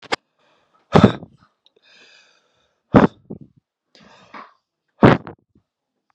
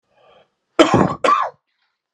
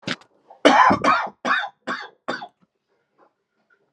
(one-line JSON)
{"exhalation_length": "6.1 s", "exhalation_amplitude": 32768, "exhalation_signal_mean_std_ratio": 0.21, "cough_length": "2.1 s", "cough_amplitude": 32768, "cough_signal_mean_std_ratio": 0.4, "three_cough_length": "3.9 s", "three_cough_amplitude": 30979, "three_cough_signal_mean_std_ratio": 0.39, "survey_phase": "beta (2021-08-13 to 2022-03-07)", "age": "18-44", "gender": "Male", "wearing_mask": "No", "symptom_cough_any": true, "symptom_fatigue": true, "symptom_headache": true, "symptom_onset": "13 days", "smoker_status": "Current smoker (1 to 10 cigarettes per day)", "respiratory_condition_asthma": false, "respiratory_condition_other": false, "recruitment_source": "REACT", "submission_delay": "2 days", "covid_test_result": "Negative", "covid_test_method": "RT-qPCR"}